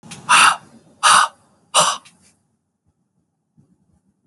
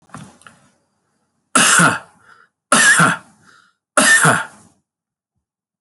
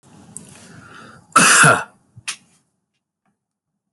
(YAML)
exhalation_length: 4.3 s
exhalation_amplitude: 29646
exhalation_signal_mean_std_ratio: 0.34
three_cough_length: 5.8 s
three_cough_amplitude: 32767
three_cough_signal_mean_std_ratio: 0.41
cough_length: 3.9 s
cough_amplitude: 32767
cough_signal_mean_std_ratio: 0.31
survey_phase: beta (2021-08-13 to 2022-03-07)
age: 45-64
gender: Male
wearing_mask: 'No'
symptom_cough_any: true
symptom_runny_or_blocked_nose: true
symptom_headache: true
symptom_change_to_sense_of_smell_or_taste: true
smoker_status: Ex-smoker
respiratory_condition_asthma: false
respiratory_condition_other: false
recruitment_source: Test and Trace
submission_delay: 2 days
covid_test_result: Positive
covid_test_method: RT-qPCR